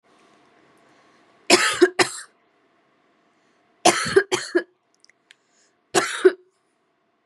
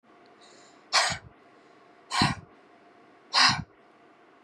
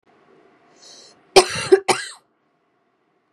{"three_cough_length": "7.3 s", "three_cough_amplitude": 32767, "three_cough_signal_mean_std_ratio": 0.3, "exhalation_length": "4.4 s", "exhalation_amplitude": 13689, "exhalation_signal_mean_std_ratio": 0.34, "cough_length": "3.3 s", "cough_amplitude": 32768, "cough_signal_mean_std_ratio": 0.24, "survey_phase": "beta (2021-08-13 to 2022-03-07)", "age": "18-44", "gender": "Female", "wearing_mask": "No", "symptom_runny_or_blocked_nose": true, "symptom_onset": "12 days", "smoker_status": "Never smoked", "respiratory_condition_asthma": true, "respiratory_condition_other": false, "recruitment_source": "REACT", "submission_delay": "3 days", "covid_test_result": "Negative", "covid_test_method": "RT-qPCR"}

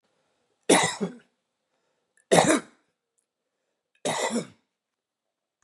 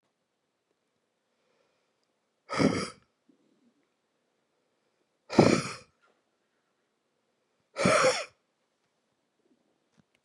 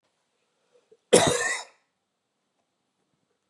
{"three_cough_length": "5.6 s", "three_cough_amplitude": 29160, "three_cough_signal_mean_std_ratio": 0.3, "exhalation_length": "10.2 s", "exhalation_amplitude": 19340, "exhalation_signal_mean_std_ratio": 0.24, "cough_length": "3.5 s", "cough_amplitude": 22829, "cough_signal_mean_std_ratio": 0.25, "survey_phase": "beta (2021-08-13 to 2022-03-07)", "age": "45-64", "gender": "Male", "wearing_mask": "No", "symptom_cough_any": true, "symptom_runny_or_blocked_nose": true, "symptom_sore_throat": true, "smoker_status": "Never smoked", "respiratory_condition_asthma": false, "respiratory_condition_other": false, "recruitment_source": "Test and Trace", "submission_delay": "2 days", "covid_test_result": "Positive", "covid_test_method": "RT-qPCR", "covid_ct_value": 22.2, "covid_ct_gene": "ORF1ab gene", "covid_ct_mean": 22.6, "covid_viral_load": "37000 copies/ml", "covid_viral_load_category": "Low viral load (10K-1M copies/ml)"}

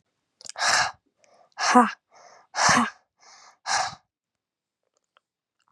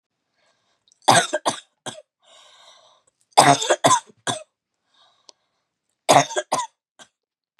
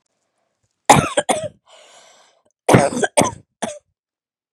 {"exhalation_length": "5.7 s", "exhalation_amplitude": 27510, "exhalation_signal_mean_std_ratio": 0.35, "three_cough_length": "7.6 s", "three_cough_amplitude": 32768, "three_cough_signal_mean_std_ratio": 0.3, "cough_length": "4.5 s", "cough_amplitude": 32768, "cough_signal_mean_std_ratio": 0.32, "survey_phase": "beta (2021-08-13 to 2022-03-07)", "age": "18-44", "gender": "Female", "wearing_mask": "No", "symptom_none": true, "symptom_onset": "12 days", "smoker_status": "Never smoked", "respiratory_condition_asthma": false, "respiratory_condition_other": false, "recruitment_source": "REACT", "submission_delay": "2 days", "covid_test_result": "Negative", "covid_test_method": "RT-qPCR"}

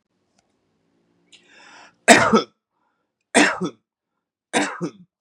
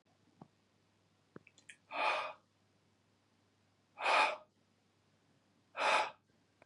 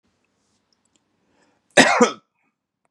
{"three_cough_length": "5.2 s", "three_cough_amplitude": 32768, "three_cough_signal_mean_std_ratio": 0.29, "exhalation_length": "6.7 s", "exhalation_amplitude": 4437, "exhalation_signal_mean_std_ratio": 0.32, "cough_length": "2.9 s", "cough_amplitude": 32767, "cough_signal_mean_std_ratio": 0.25, "survey_phase": "beta (2021-08-13 to 2022-03-07)", "age": "45-64", "gender": "Male", "wearing_mask": "No", "symptom_none": true, "smoker_status": "Ex-smoker", "respiratory_condition_asthma": false, "respiratory_condition_other": false, "recruitment_source": "REACT", "submission_delay": "1 day", "covid_test_result": "Negative", "covid_test_method": "RT-qPCR", "influenza_a_test_result": "Negative", "influenza_b_test_result": "Negative"}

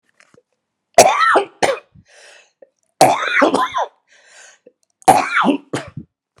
{"three_cough_length": "6.4 s", "three_cough_amplitude": 32768, "three_cough_signal_mean_std_ratio": 0.42, "survey_phase": "beta (2021-08-13 to 2022-03-07)", "age": "65+", "gender": "Female", "wearing_mask": "No", "symptom_cough_any": true, "smoker_status": "Never smoked", "respiratory_condition_asthma": false, "respiratory_condition_other": false, "recruitment_source": "REACT", "submission_delay": "3 days", "covid_test_result": "Negative", "covid_test_method": "RT-qPCR", "influenza_a_test_result": "Negative", "influenza_b_test_result": "Negative"}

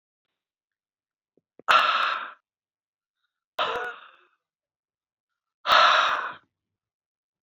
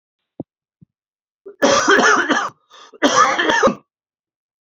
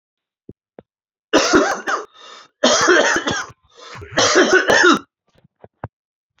{"exhalation_length": "7.4 s", "exhalation_amplitude": 26412, "exhalation_signal_mean_std_ratio": 0.33, "cough_length": "4.6 s", "cough_amplitude": 28066, "cough_signal_mean_std_ratio": 0.49, "three_cough_length": "6.4 s", "three_cough_amplitude": 28075, "three_cough_signal_mean_std_ratio": 0.49, "survey_phase": "alpha (2021-03-01 to 2021-08-12)", "age": "18-44", "gender": "Male", "wearing_mask": "No", "symptom_cough_any": true, "symptom_headache": true, "smoker_status": "Ex-smoker", "respiratory_condition_asthma": false, "respiratory_condition_other": false, "recruitment_source": "Test and Trace", "submission_delay": "2 days", "covid_test_result": "Positive", "covid_test_method": "RT-qPCR", "covid_ct_value": 32.6, "covid_ct_gene": "N gene", "covid_ct_mean": 33.1, "covid_viral_load": "14 copies/ml", "covid_viral_load_category": "Minimal viral load (< 10K copies/ml)"}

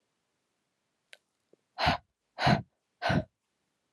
{"exhalation_length": "3.9 s", "exhalation_amplitude": 8947, "exhalation_signal_mean_std_ratio": 0.3, "survey_phase": "alpha (2021-03-01 to 2021-08-12)", "age": "18-44", "gender": "Female", "wearing_mask": "No", "symptom_cough_any": true, "symptom_new_continuous_cough": true, "symptom_shortness_of_breath": true, "symptom_abdominal_pain": true, "symptom_diarrhoea": true, "symptom_fatigue": true, "symptom_headache": true, "symptom_onset": "5 days", "smoker_status": "Never smoked", "respiratory_condition_asthma": false, "respiratory_condition_other": false, "recruitment_source": "Test and Trace", "submission_delay": "3 days", "covid_test_result": "Positive", "covid_test_method": "ePCR"}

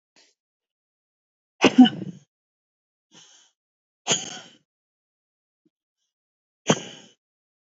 {"exhalation_length": "7.8 s", "exhalation_amplitude": 25857, "exhalation_signal_mean_std_ratio": 0.17, "survey_phase": "beta (2021-08-13 to 2022-03-07)", "age": "45-64", "gender": "Female", "wearing_mask": "No", "symptom_cough_any": true, "symptom_new_continuous_cough": true, "symptom_runny_or_blocked_nose": true, "symptom_fatigue": true, "symptom_change_to_sense_of_smell_or_taste": true, "symptom_onset": "2 days", "smoker_status": "Current smoker (e-cigarettes or vapes only)", "respiratory_condition_asthma": false, "respiratory_condition_other": false, "recruitment_source": "Test and Trace", "submission_delay": "1 day", "covid_test_result": "Positive", "covid_test_method": "RT-qPCR", "covid_ct_value": 33.0, "covid_ct_gene": "N gene"}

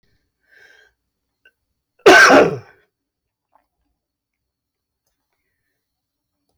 {"cough_length": "6.6 s", "cough_amplitude": 32608, "cough_signal_mean_std_ratio": 0.23, "survey_phase": "beta (2021-08-13 to 2022-03-07)", "age": "45-64", "gender": "Male", "wearing_mask": "No", "symptom_none": true, "smoker_status": "Ex-smoker", "respiratory_condition_asthma": false, "respiratory_condition_other": false, "recruitment_source": "REACT", "submission_delay": "1 day", "covid_test_result": "Negative", "covid_test_method": "RT-qPCR", "influenza_a_test_result": "Negative", "influenza_b_test_result": "Negative"}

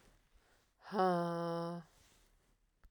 {"exhalation_length": "2.9 s", "exhalation_amplitude": 3322, "exhalation_signal_mean_std_ratio": 0.45, "survey_phase": "beta (2021-08-13 to 2022-03-07)", "age": "45-64", "gender": "Female", "wearing_mask": "No", "symptom_cough_any": true, "symptom_runny_or_blocked_nose": true, "symptom_sore_throat": true, "symptom_onset": "4 days", "smoker_status": "Ex-smoker", "respiratory_condition_asthma": false, "respiratory_condition_other": false, "recruitment_source": "Test and Trace", "submission_delay": "1 day", "covid_test_result": "Positive", "covid_test_method": "RT-qPCR", "covid_ct_value": 21.4, "covid_ct_gene": "N gene"}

